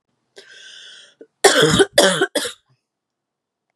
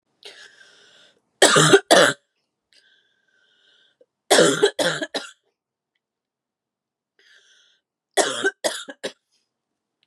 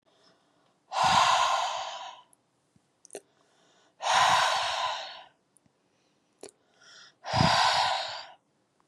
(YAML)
cough_length: 3.8 s
cough_amplitude: 32768
cough_signal_mean_std_ratio: 0.37
three_cough_length: 10.1 s
three_cough_amplitude: 32767
three_cough_signal_mean_std_ratio: 0.3
exhalation_length: 8.9 s
exhalation_amplitude: 10781
exhalation_signal_mean_std_ratio: 0.49
survey_phase: beta (2021-08-13 to 2022-03-07)
age: 18-44
gender: Female
wearing_mask: 'No'
symptom_cough_any: true
symptom_fatigue: true
smoker_status: Never smoked
respiratory_condition_asthma: false
respiratory_condition_other: false
recruitment_source: Test and Trace
submission_delay: 1 day
covid_test_result: Positive
covid_test_method: RT-qPCR
covid_ct_value: 26.2
covid_ct_gene: ORF1ab gene